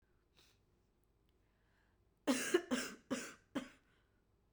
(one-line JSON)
{"three_cough_length": "4.5 s", "three_cough_amplitude": 3559, "three_cough_signal_mean_std_ratio": 0.32, "survey_phase": "beta (2021-08-13 to 2022-03-07)", "age": "18-44", "gender": "Female", "wearing_mask": "No", "symptom_cough_any": true, "symptom_runny_or_blocked_nose": true, "symptom_sore_throat": true, "symptom_headache": true, "smoker_status": "Never smoked", "respiratory_condition_asthma": false, "respiratory_condition_other": false, "recruitment_source": "Test and Trace", "submission_delay": "2 days", "covid_test_result": "Positive", "covid_test_method": "RT-qPCR", "covid_ct_value": 35.7, "covid_ct_gene": "ORF1ab gene"}